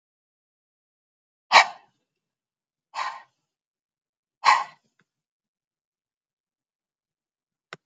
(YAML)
exhalation_length: 7.9 s
exhalation_amplitude: 32767
exhalation_signal_mean_std_ratio: 0.16
survey_phase: beta (2021-08-13 to 2022-03-07)
age: 45-64
gender: Female
wearing_mask: 'No'
symptom_none: true
smoker_status: Never smoked
respiratory_condition_asthma: false
respiratory_condition_other: false
recruitment_source: REACT
submission_delay: 2 days
covid_test_result: Negative
covid_test_method: RT-qPCR